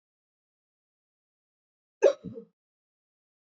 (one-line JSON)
{"cough_length": "3.4 s", "cough_amplitude": 10790, "cough_signal_mean_std_ratio": 0.15, "survey_phase": "beta (2021-08-13 to 2022-03-07)", "age": "18-44", "gender": "Female", "wearing_mask": "No", "symptom_none": true, "smoker_status": "Ex-smoker", "respiratory_condition_asthma": false, "respiratory_condition_other": false, "recruitment_source": "Test and Trace", "submission_delay": "1 day", "covid_test_result": "Negative", "covid_test_method": "RT-qPCR"}